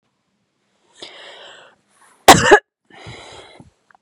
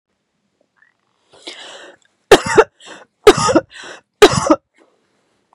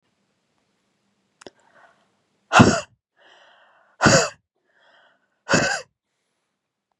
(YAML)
cough_length: 4.0 s
cough_amplitude: 32768
cough_signal_mean_std_ratio: 0.23
three_cough_length: 5.5 s
three_cough_amplitude: 32768
three_cough_signal_mean_std_ratio: 0.29
exhalation_length: 7.0 s
exhalation_amplitude: 32766
exhalation_signal_mean_std_ratio: 0.25
survey_phase: beta (2021-08-13 to 2022-03-07)
age: 18-44
gender: Female
wearing_mask: 'No'
symptom_none: true
smoker_status: Never smoked
respiratory_condition_asthma: true
respiratory_condition_other: false
recruitment_source: REACT
submission_delay: 0 days
covid_test_result: Negative
covid_test_method: RT-qPCR
influenza_a_test_result: Negative
influenza_b_test_result: Negative